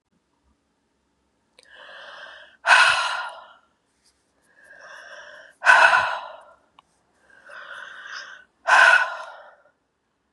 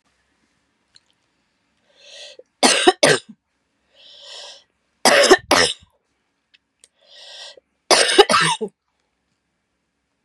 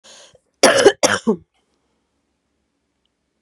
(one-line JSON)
{"exhalation_length": "10.3 s", "exhalation_amplitude": 30172, "exhalation_signal_mean_std_ratio": 0.33, "three_cough_length": "10.2 s", "three_cough_amplitude": 32768, "three_cough_signal_mean_std_ratio": 0.31, "cough_length": "3.4 s", "cough_amplitude": 32768, "cough_signal_mean_std_ratio": 0.29, "survey_phase": "beta (2021-08-13 to 2022-03-07)", "age": "45-64", "gender": "Female", "wearing_mask": "Yes", "symptom_cough_any": true, "symptom_runny_or_blocked_nose": true, "symptom_fatigue": true, "symptom_headache": true, "symptom_change_to_sense_of_smell_or_taste": true, "symptom_loss_of_taste": true, "symptom_onset": "4 days", "smoker_status": "Never smoked", "respiratory_condition_asthma": false, "respiratory_condition_other": false, "recruitment_source": "Test and Trace", "submission_delay": "1 day", "covid_test_result": "Positive", "covid_test_method": "ePCR"}